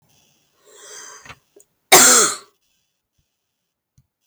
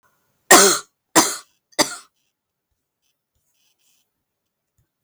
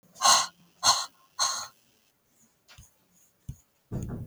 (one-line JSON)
{"cough_length": "4.3 s", "cough_amplitude": 32768, "cough_signal_mean_std_ratio": 0.27, "three_cough_length": "5.0 s", "three_cough_amplitude": 32768, "three_cough_signal_mean_std_ratio": 0.25, "exhalation_length": "4.3 s", "exhalation_amplitude": 15101, "exhalation_signal_mean_std_ratio": 0.34, "survey_phase": "beta (2021-08-13 to 2022-03-07)", "age": "45-64", "gender": "Female", "wearing_mask": "No", "symptom_cough_any": true, "symptom_new_continuous_cough": true, "symptom_shortness_of_breath": true, "symptom_sore_throat": true, "symptom_fatigue": true, "symptom_headache": true, "symptom_onset": "3 days", "smoker_status": "Never smoked", "respiratory_condition_asthma": true, "respiratory_condition_other": false, "recruitment_source": "Test and Trace", "submission_delay": "1 day", "covid_test_result": "Positive", "covid_test_method": "RT-qPCR", "covid_ct_value": 28.8, "covid_ct_gene": "ORF1ab gene"}